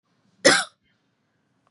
{"cough_length": "1.7 s", "cough_amplitude": 26278, "cough_signal_mean_std_ratio": 0.25, "survey_phase": "beta (2021-08-13 to 2022-03-07)", "age": "18-44", "gender": "Female", "wearing_mask": "No", "symptom_headache": true, "smoker_status": "Never smoked", "respiratory_condition_asthma": false, "respiratory_condition_other": false, "recruitment_source": "REACT", "submission_delay": "1 day", "covid_test_result": "Negative", "covid_test_method": "RT-qPCR", "influenza_a_test_result": "Negative", "influenza_b_test_result": "Negative"}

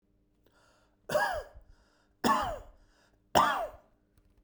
{"three_cough_length": "4.4 s", "three_cough_amplitude": 12820, "three_cough_signal_mean_std_ratio": 0.38, "survey_phase": "beta (2021-08-13 to 2022-03-07)", "age": "45-64", "gender": "Male", "wearing_mask": "No", "symptom_none": true, "smoker_status": "Never smoked", "respiratory_condition_asthma": false, "respiratory_condition_other": false, "recruitment_source": "REACT", "submission_delay": "1 day", "covid_test_result": "Negative", "covid_test_method": "RT-qPCR"}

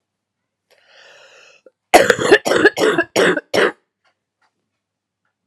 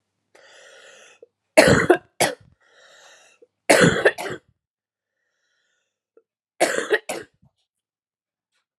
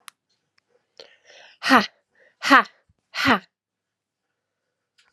{"cough_length": "5.5 s", "cough_amplitude": 32768, "cough_signal_mean_std_ratio": 0.37, "three_cough_length": "8.8 s", "three_cough_amplitude": 32768, "three_cough_signal_mean_std_ratio": 0.29, "exhalation_length": "5.1 s", "exhalation_amplitude": 32076, "exhalation_signal_mean_std_ratio": 0.24, "survey_phase": "beta (2021-08-13 to 2022-03-07)", "age": "18-44", "gender": "Female", "wearing_mask": "No", "symptom_cough_any": true, "symptom_fatigue": true, "symptom_change_to_sense_of_smell_or_taste": true, "symptom_loss_of_taste": true, "symptom_other": true, "symptom_onset": "5 days", "smoker_status": "Never smoked", "respiratory_condition_asthma": true, "respiratory_condition_other": false, "recruitment_source": "Test and Trace", "submission_delay": "2 days", "covid_test_result": "Positive", "covid_test_method": "RT-qPCR", "covid_ct_value": 14.6, "covid_ct_gene": "N gene", "covid_ct_mean": 14.8, "covid_viral_load": "14000000 copies/ml", "covid_viral_load_category": "High viral load (>1M copies/ml)"}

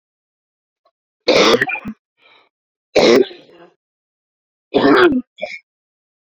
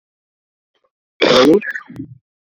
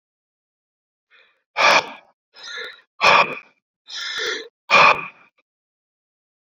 {"three_cough_length": "6.3 s", "three_cough_amplitude": 32378, "three_cough_signal_mean_std_ratio": 0.38, "cough_length": "2.6 s", "cough_amplitude": 30163, "cough_signal_mean_std_ratio": 0.37, "exhalation_length": "6.6 s", "exhalation_amplitude": 27268, "exhalation_signal_mean_std_ratio": 0.33, "survey_phase": "beta (2021-08-13 to 2022-03-07)", "age": "45-64", "gender": "Male", "wearing_mask": "Yes", "symptom_cough_any": true, "symptom_fatigue": true, "symptom_fever_high_temperature": true, "symptom_change_to_sense_of_smell_or_taste": true, "smoker_status": "Never smoked", "respiratory_condition_asthma": false, "respiratory_condition_other": false, "recruitment_source": "Test and Trace", "submission_delay": "2 days", "covid_test_result": "Positive", "covid_test_method": "RT-qPCR", "covid_ct_value": 22.6, "covid_ct_gene": "ORF1ab gene", "covid_ct_mean": 23.4, "covid_viral_load": "21000 copies/ml", "covid_viral_load_category": "Low viral load (10K-1M copies/ml)"}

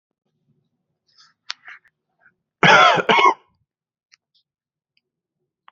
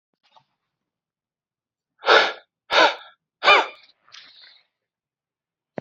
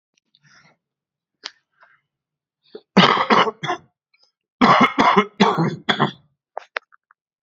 {"cough_length": "5.7 s", "cough_amplitude": 28836, "cough_signal_mean_std_ratio": 0.27, "exhalation_length": "5.8 s", "exhalation_amplitude": 29768, "exhalation_signal_mean_std_ratio": 0.27, "three_cough_length": "7.4 s", "three_cough_amplitude": 31736, "three_cough_signal_mean_std_ratio": 0.37, "survey_phase": "beta (2021-08-13 to 2022-03-07)", "age": "45-64", "gender": "Male", "wearing_mask": "Yes", "symptom_cough_any": true, "symptom_runny_or_blocked_nose": true, "symptom_sore_throat": true, "symptom_fatigue": true, "smoker_status": "Never smoked", "respiratory_condition_asthma": false, "respiratory_condition_other": false, "recruitment_source": "Test and Trace", "submission_delay": "2 days", "covid_test_result": "Positive", "covid_test_method": "RT-qPCR", "covid_ct_value": 16.9, "covid_ct_gene": "ORF1ab gene", "covid_ct_mean": 17.5, "covid_viral_load": "1900000 copies/ml", "covid_viral_load_category": "High viral load (>1M copies/ml)"}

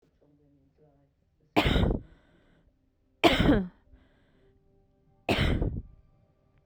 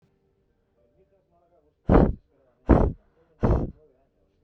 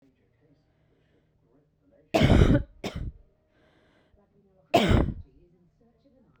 {"three_cough_length": "6.7 s", "three_cough_amplitude": 17554, "three_cough_signal_mean_std_ratio": 0.36, "exhalation_length": "4.4 s", "exhalation_amplitude": 21105, "exhalation_signal_mean_std_ratio": 0.31, "cough_length": "6.4 s", "cough_amplitude": 17926, "cough_signal_mean_std_ratio": 0.31, "survey_phase": "beta (2021-08-13 to 2022-03-07)", "age": "18-44", "gender": "Female", "wearing_mask": "No", "symptom_none": true, "symptom_onset": "7 days", "smoker_status": "Current smoker (e-cigarettes or vapes only)", "respiratory_condition_asthma": false, "respiratory_condition_other": false, "recruitment_source": "REACT", "submission_delay": "2 days", "covid_test_result": "Negative", "covid_test_method": "RT-qPCR", "influenza_a_test_result": "Negative", "influenza_b_test_result": "Negative"}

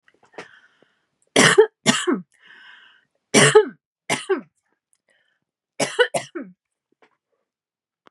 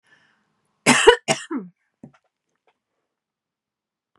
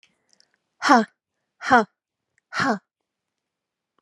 {"three_cough_length": "8.1 s", "three_cough_amplitude": 32111, "three_cough_signal_mean_std_ratio": 0.3, "cough_length": "4.2 s", "cough_amplitude": 32768, "cough_signal_mean_std_ratio": 0.23, "exhalation_length": "4.0 s", "exhalation_amplitude": 31880, "exhalation_signal_mean_std_ratio": 0.27, "survey_phase": "beta (2021-08-13 to 2022-03-07)", "age": "45-64", "gender": "Female", "wearing_mask": "No", "symptom_none": true, "smoker_status": "Never smoked", "respiratory_condition_asthma": false, "respiratory_condition_other": false, "recruitment_source": "REACT", "submission_delay": "6 days", "covid_test_result": "Negative", "covid_test_method": "RT-qPCR", "influenza_a_test_result": "Negative", "influenza_b_test_result": "Negative"}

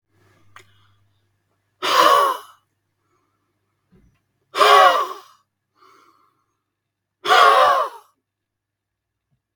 {"exhalation_length": "9.6 s", "exhalation_amplitude": 32768, "exhalation_signal_mean_std_ratio": 0.34, "survey_phase": "beta (2021-08-13 to 2022-03-07)", "age": "45-64", "gender": "Male", "wearing_mask": "No", "symptom_none": true, "smoker_status": "Never smoked", "respiratory_condition_asthma": false, "respiratory_condition_other": false, "recruitment_source": "REACT", "submission_delay": "1 day", "covid_test_result": "Negative", "covid_test_method": "RT-qPCR", "influenza_a_test_result": "Negative", "influenza_b_test_result": "Negative"}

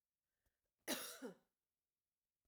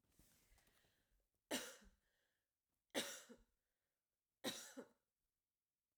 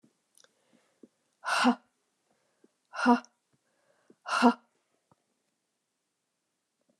{"cough_length": "2.5 s", "cough_amplitude": 1044, "cough_signal_mean_std_ratio": 0.3, "three_cough_length": "6.0 s", "three_cough_amplitude": 977, "three_cough_signal_mean_std_ratio": 0.28, "exhalation_length": "7.0 s", "exhalation_amplitude": 14787, "exhalation_signal_mean_std_ratio": 0.24, "survey_phase": "alpha (2021-03-01 to 2021-08-12)", "age": "45-64", "gender": "Female", "wearing_mask": "No", "symptom_none": true, "symptom_onset": "8 days", "smoker_status": "Ex-smoker", "respiratory_condition_asthma": false, "respiratory_condition_other": false, "recruitment_source": "REACT", "submission_delay": "1 day", "covid_test_result": "Negative", "covid_test_method": "RT-qPCR"}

